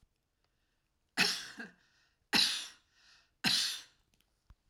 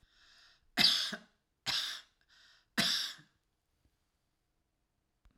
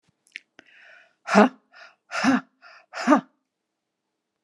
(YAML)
three_cough_length: 4.7 s
three_cough_amplitude: 5931
three_cough_signal_mean_std_ratio: 0.35
cough_length: 5.4 s
cough_amplitude: 7632
cough_signal_mean_std_ratio: 0.33
exhalation_length: 4.4 s
exhalation_amplitude: 30183
exhalation_signal_mean_std_ratio: 0.29
survey_phase: alpha (2021-03-01 to 2021-08-12)
age: 65+
gender: Female
wearing_mask: 'No'
symptom_none: true
smoker_status: Never smoked
respiratory_condition_asthma: false
respiratory_condition_other: false
recruitment_source: REACT
submission_delay: 1 day
covid_test_result: Negative
covid_test_method: RT-qPCR